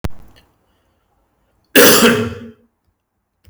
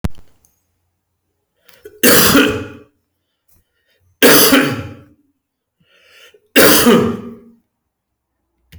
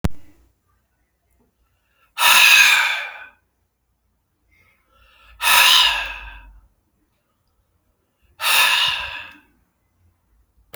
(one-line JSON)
{"cough_length": "3.5 s", "cough_amplitude": 32768, "cough_signal_mean_std_ratio": 0.35, "three_cough_length": "8.8 s", "three_cough_amplitude": 32768, "three_cough_signal_mean_std_ratio": 0.39, "exhalation_length": "10.8 s", "exhalation_amplitude": 32767, "exhalation_signal_mean_std_ratio": 0.38, "survey_phase": "beta (2021-08-13 to 2022-03-07)", "age": "45-64", "gender": "Male", "wearing_mask": "No", "symptom_none": true, "smoker_status": "Never smoked", "respiratory_condition_asthma": false, "respiratory_condition_other": false, "recruitment_source": "REACT", "submission_delay": "2 days", "covid_test_result": "Negative", "covid_test_method": "RT-qPCR"}